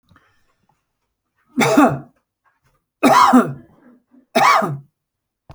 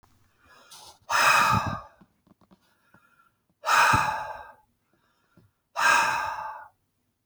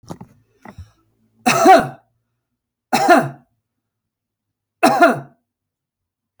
{
  "three_cough_length": "5.5 s",
  "three_cough_amplitude": 28836,
  "three_cough_signal_mean_std_ratio": 0.39,
  "exhalation_length": "7.3 s",
  "exhalation_amplitude": 15072,
  "exhalation_signal_mean_std_ratio": 0.43,
  "cough_length": "6.4 s",
  "cough_amplitude": 30366,
  "cough_signal_mean_std_ratio": 0.33,
  "survey_phase": "beta (2021-08-13 to 2022-03-07)",
  "age": "65+",
  "gender": "Male",
  "wearing_mask": "No",
  "symptom_none": true,
  "smoker_status": "Ex-smoker",
  "respiratory_condition_asthma": false,
  "respiratory_condition_other": false,
  "recruitment_source": "REACT",
  "submission_delay": "9 days",
  "covid_test_result": "Negative",
  "covid_test_method": "RT-qPCR"
}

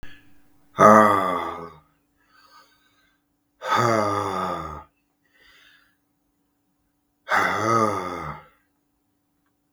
{
  "exhalation_length": "9.7 s",
  "exhalation_amplitude": 32766,
  "exhalation_signal_mean_std_ratio": 0.38,
  "survey_phase": "beta (2021-08-13 to 2022-03-07)",
  "age": "45-64",
  "gender": "Male",
  "wearing_mask": "No",
  "symptom_cough_any": true,
  "symptom_runny_or_blocked_nose": true,
  "symptom_change_to_sense_of_smell_or_taste": true,
  "symptom_onset": "3 days",
  "smoker_status": "Never smoked",
  "respiratory_condition_asthma": false,
  "respiratory_condition_other": false,
  "recruitment_source": "Test and Trace",
  "submission_delay": "2 days",
  "covid_test_result": "Positive",
  "covid_test_method": "ePCR"
}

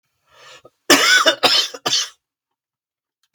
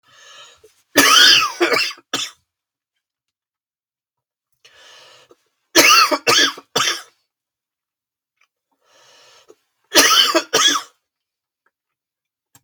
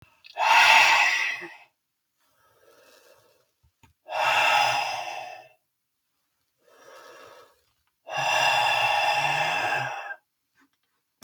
{
  "cough_length": "3.3 s",
  "cough_amplitude": 32768,
  "cough_signal_mean_std_ratio": 0.41,
  "three_cough_length": "12.6 s",
  "three_cough_amplitude": 32768,
  "three_cough_signal_mean_std_ratio": 0.36,
  "exhalation_length": "11.2 s",
  "exhalation_amplitude": 22046,
  "exhalation_signal_mean_std_ratio": 0.49,
  "survey_phase": "beta (2021-08-13 to 2022-03-07)",
  "age": "45-64",
  "gender": "Male",
  "wearing_mask": "No",
  "symptom_cough_any": true,
  "smoker_status": "Ex-smoker",
  "respiratory_condition_asthma": false,
  "respiratory_condition_other": false,
  "recruitment_source": "Test and Trace",
  "submission_delay": "2 days",
  "covid_test_result": "Positive",
  "covid_test_method": "RT-qPCR",
  "covid_ct_value": 16.5,
  "covid_ct_gene": "ORF1ab gene",
  "covid_ct_mean": 16.8,
  "covid_viral_load": "3200000 copies/ml",
  "covid_viral_load_category": "High viral load (>1M copies/ml)"
}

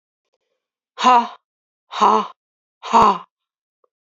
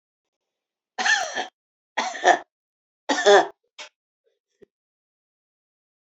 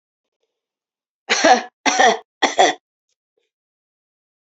{
  "exhalation_length": "4.2 s",
  "exhalation_amplitude": 29513,
  "exhalation_signal_mean_std_ratio": 0.34,
  "cough_length": "6.1 s",
  "cough_amplitude": 24343,
  "cough_signal_mean_std_ratio": 0.29,
  "three_cough_length": "4.4 s",
  "three_cough_amplitude": 28774,
  "three_cough_signal_mean_std_ratio": 0.34,
  "survey_phase": "beta (2021-08-13 to 2022-03-07)",
  "age": "45-64",
  "gender": "Female",
  "wearing_mask": "No",
  "symptom_none": true,
  "symptom_onset": "9 days",
  "smoker_status": "Never smoked",
  "respiratory_condition_asthma": true,
  "respiratory_condition_other": false,
  "recruitment_source": "REACT",
  "submission_delay": "3 days",
  "covid_test_result": "Negative",
  "covid_test_method": "RT-qPCR"
}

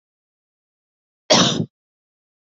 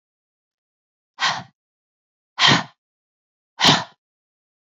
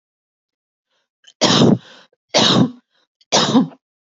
{
  "cough_length": "2.6 s",
  "cough_amplitude": 28510,
  "cough_signal_mean_std_ratio": 0.27,
  "exhalation_length": "4.8 s",
  "exhalation_amplitude": 27693,
  "exhalation_signal_mean_std_ratio": 0.27,
  "three_cough_length": "4.0 s",
  "three_cough_amplitude": 32768,
  "three_cough_signal_mean_std_ratio": 0.43,
  "survey_phase": "beta (2021-08-13 to 2022-03-07)",
  "age": "18-44",
  "gender": "Female",
  "wearing_mask": "No",
  "symptom_none": true,
  "smoker_status": "Never smoked",
  "respiratory_condition_asthma": false,
  "respiratory_condition_other": false,
  "recruitment_source": "REACT",
  "submission_delay": "3 days",
  "covid_test_result": "Negative",
  "covid_test_method": "RT-qPCR",
  "influenza_a_test_result": "Negative",
  "influenza_b_test_result": "Negative"
}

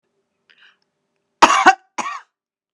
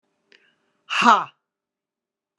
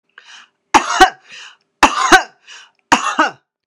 {
  "cough_length": "2.7 s",
  "cough_amplitude": 32768,
  "cough_signal_mean_std_ratio": 0.27,
  "exhalation_length": "2.4 s",
  "exhalation_amplitude": 30670,
  "exhalation_signal_mean_std_ratio": 0.26,
  "three_cough_length": "3.7 s",
  "three_cough_amplitude": 32768,
  "three_cough_signal_mean_std_ratio": 0.38,
  "survey_phase": "beta (2021-08-13 to 2022-03-07)",
  "age": "65+",
  "gender": "Female",
  "wearing_mask": "No",
  "symptom_none": true,
  "smoker_status": "Ex-smoker",
  "respiratory_condition_asthma": false,
  "respiratory_condition_other": false,
  "recruitment_source": "REACT",
  "submission_delay": "1 day",
  "covid_test_result": "Negative",
  "covid_test_method": "RT-qPCR"
}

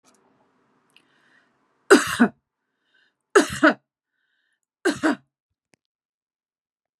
{
  "three_cough_length": "7.0 s",
  "three_cough_amplitude": 31446,
  "three_cough_signal_mean_std_ratio": 0.24,
  "survey_phase": "beta (2021-08-13 to 2022-03-07)",
  "age": "45-64",
  "gender": "Female",
  "wearing_mask": "No",
  "symptom_none": true,
  "smoker_status": "Never smoked",
  "respiratory_condition_asthma": false,
  "respiratory_condition_other": false,
  "recruitment_source": "REACT",
  "submission_delay": "1 day",
  "covid_test_result": "Negative",
  "covid_test_method": "RT-qPCR"
}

